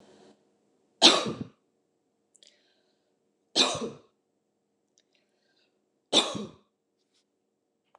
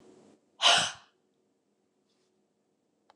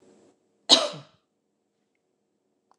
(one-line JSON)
{"three_cough_length": "8.0 s", "three_cough_amplitude": 25418, "three_cough_signal_mean_std_ratio": 0.23, "exhalation_length": "3.2 s", "exhalation_amplitude": 10742, "exhalation_signal_mean_std_ratio": 0.24, "cough_length": "2.8 s", "cough_amplitude": 27636, "cough_signal_mean_std_ratio": 0.19, "survey_phase": "beta (2021-08-13 to 2022-03-07)", "age": "45-64", "gender": "Female", "wearing_mask": "No", "symptom_none": true, "smoker_status": "Never smoked", "respiratory_condition_asthma": false, "respiratory_condition_other": false, "recruitment_source": "REACT", "submission_delay": "3 days", "covid_test_result": "Negative", "covid_test_method": "RT-qPCR", "influenza_a_test_result": "Negative", "influenza_b_test_result": "Negative"}